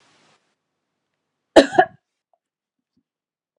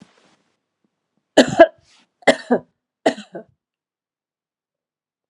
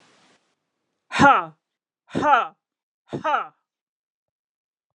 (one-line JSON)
{"cough_length": "3.6 s", "cough_amplitude": 32768, "cough_signal_mean_std_ratio": 0.16, "three_cough_length": "5.3 s", "three_cough_amplitude": 32768, "three_cough_signal_mean_std_ratio": 0.21, "exhalation_length": "4.9 s", "exhalation_amplitude": 28397, "exhalation_signal_mean_std_ratio": 0.3, "survey_phase": "beta (2021-08-13 to 2022-03-07)", "age": "45-64", "gender": "Female", "wearing_mask": "No", "symptom_none": true, "smoker_status": "Never smoked", "respiratory_condition_asthma": false, "respiratory_condition_other": false, "recruitment_source": "REACT", "submission_delay": "1 day", "covid_test_result": "Negative", "covid_test_method": "RT-qPCR", "influenza_a_test_result": "Negative", "influenza_b_test_result": "Negative"}